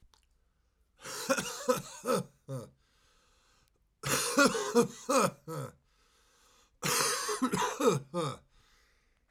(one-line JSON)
{"three_cough_length": "9.3 s", "three_cough_amplitude": 8451, "three_cough_signal_mean_std_ratio": 0.47, "survey_phase": "alpha (2021-03-01 to 2021-08-12)", "age": "45-64", "gender": "Male", "wearing_mask": "No", "symptom_fatigue": true, "symptom_headache": true, "symptom_change_to_sense_of_smell_or_taste": true, "symptom_loss_of_taste": true, "smoker_status": "Current smoker (1 to 10 cigarettes per day)", "respiratory_condition_asthma": false, "respiratory_condition_other": false, "recruitment_source": "Test and Trace", "submission_delay": "2 days", "covid_test_result": "Positive", "covid_test_method": "RT-qPCR", "covid_ct_value": 16.2, "covid_ct_gene": "ORF1ab gene", "covid_ct_mean": 16.8, "covid_viral_load": "3100000 copies/ml", "covid_viral_load_category": "High viral load (>1M copies/ml)"}